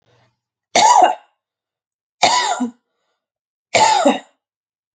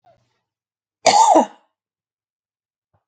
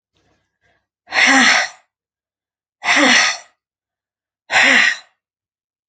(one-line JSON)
{"three_cough_length": "4.9 s", "three_cough_amplitude": 31295, "three_cough_signal_mean_std_ratio": 0.41, "cough_length": "3.1 s", "cough_amplitude": 29773, "cough_signal_mean_std_ratio": 0.3, "exhalation_length": "5.9 s", "exhalation_amplitude": 32767, "exhalation_signal_mean_std_ratio": 0.42, "survey_phase": "alpha (2021-03-01 to 2021-08-12)", "age": "45-64", "gender": "Female", "wearing_mask": "No", "symptom_none": true, "smoker_status": "Never smoked", "respiratory_condition_asthma": false, "respiratory_condition_other": false, "recruitment_source": "REACT", "submission_delay": "3 days", "covid_test_result": "Negative", "covid_test_method": "RT-qPCR"}